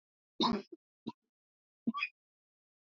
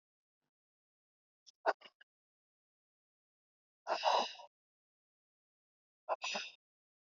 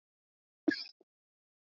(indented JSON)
{
  "three_cough_length": "2.9 s",
  "three_cough_amplitude": 4748,
  "three_cough_signal_mean_std_ratio": 0.29,
  "exhalation_length": "7.2 s",
  "exhalation_amplitude": 3837,
  "exhalation_signal_mean_std_ratio": 0.24,
  "cough_length": "1.7 s",
  "cough_amplitude": 4363,
  "cough_signal_mean_std_ratio": 0.18,
  "survey_phase": "beta (2021-08-13 to 2022-03-07)",
  "age": "18-44",
  "gender": "Female",
  "wearing_mask": "No",
  "symptom_sore_throat": true,
  "symptom_fatigue": true,
  "symptom_headache": true,
  "symptom_onset": "3 days",
  "smoker_status": "Ex-smoker",
  "respiratory_condition_asthma": true,
  "respiratory_condition_other": false,
  "recruitment_source": "REACT",
  "submission_delay": "1 day",
  "covid_test_result": "Negative",
  "covid_test_method": "RT-qPCR",
  "influenza_a_test_result": "Negative",
  "influenza_b_test_result": "Negative"
}